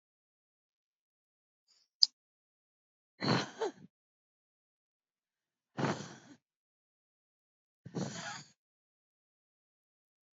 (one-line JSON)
{"exhalation_length": "10.3 s", "exhalation_amplitude": 20301, "exhalation_signal_mean_std_ratio": 0.2, "survey_phase": "alpha (2021-03-01 to 2021-08-12)", "age": "45-64", "gender": "Female", "wearing_mask": "No", "symptom_cough_any": true, "symptom_shortness_of_breath": true, "symptom_abdominal_pain": true, "symptom_diarrhoea": true, "symptom_fatigue": true, "symptom_headache": true, "symptom_change_to_sense_of_smell_or_taste": true, "smoker_status": "Ex-smoker", "respiratory_condition_asthma": false, "respiratory_condition_other": false, "recruitment_source": "Test and Trace", "submission_delay": "3 days", "covid_test_result": "Positive", "covid_test_method": "RT-qPCR", "covid_ct_value": 30.0, "covid_ct_gene": "ORF1ab gene", "covid_ct_mean": 31.0, "covid_viral_load": "70 copies/ml", "covid_viral_load_category": "Minimal viral load (< 10K copies/ml)"}